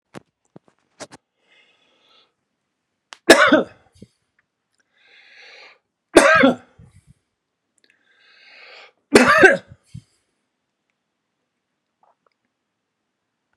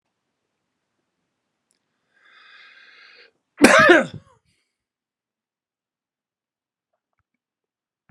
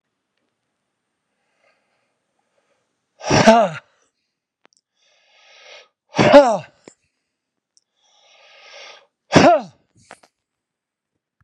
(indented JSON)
{
  "three_cough_length": "13.6 s",
  "three_cough_amplitude": 32768,
  "three_cough_signal_mean_std_ratio": 0.23,
  "cough_length": "8.1 s",
  "cough_amplitude": 32768,
  "cough_signal_mean_std_ratio": 0.19,
  "exhalation_length": "11.4 s",
  "exhalation_amplitude": 32768,
  "exhalation_signal_mean_std_ratio": 0.25,
  "survey_phase": "beta (2021-08-13 to 2022-03-07)",
  "age": "65+",
  "gender": "Male",
  "wearing_mask": "No",
  "symptom_none": true,
  "smoker_status": "Ex-smoker",
  "respiratory_condition_asthma": false,
  "respiratory_condition_other": false,
  "recruitment_source": "REACT",
  "submission_delay": "2 days",
  "covid_test_result": "Negative",
  "covid_test_method": "RT-qPCR"
}